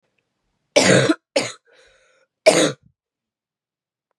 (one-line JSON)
{"three_cough_length": "4.2 s", "three_cough_amplitude": 32767, "three_cough_signal_mean_std_ratio": 0.32, "survey_phase": "beta (2021-08-13 to 2022-03-07)", "age": "18-44", "gender": "Female", "wearing_mask": "No", "symptom_cough_any": true, "symptom_runny_or_blocked_nose": true, "symptom_fatigue": true, "symptom_fever_high_temperature": true, "symptom_headache": true, "symptom_change_to_sense_of_smell_or_taste": true, "symptom_loss_of_taste": true, "symptom_onset": "5 days", "smoker_status": "Never smoked", "respiratory_condition_asthma": false, "respiratory_condition_other": false, "recruitment_source": "Test and Trace", "submission_delay": "1 day", "covid_test_result": "Positive", "covid_test_method": "RT-qPCR", "covid_ct_value": 13.4, "covid_ct_gene": "ORF1ab gene"}